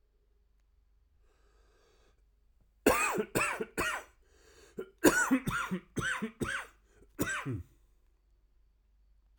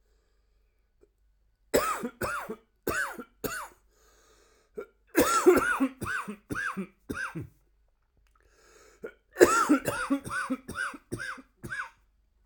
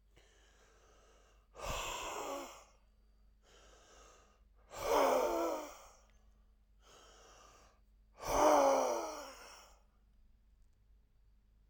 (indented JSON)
{
  "cough_length": "9.4 s",
  "cough_amplitude": 12427,
  "cough_signal_mean_std_ratio": 0.4,
  "three_cough_length": "12.5 s",
  "three_cough_amplitude": 27095,
  "three_cough_signal_mean_std_ratio": 0.41,
  "exhalation_length": "11.7 s",
  "exhalation_amplitude": 4886,
  "exhalation_signal_mean_std_ratio": 0.39,
  "survey_phase": "beta (2021-08-13 to 2022-03-07)",
  "age": "45-64",
  "gender": "Male",
  "wearing_mask": "No",
  "symptom_cough_any": true,
  "symptom_runny_or_blocked_nose": true,
  "symptom_fatigue": true,
  "symptom_headache": true,
  "symptom_onset": "5 days",
  "smoker_status": "Never smoked",
  "respiratory_condition_asthma": false,
  "respiratory_condition_other": false,
  "recruitment_source": "Test and Trace",
  "submission_delay": "2 days",
  "covid_test_result": "Positive",
  "covid_test_method": "RT-qPCR",
  "covid_ct_value": 13.9,
  "covid_ct_gene": "ORF1ab gene",
  "covid_ct_mean": 14.8,
  "covid_viral_load": "13000000 copies/ml",
  "covid_viral_load_category": "High viral load (>1M copies/ml)"
}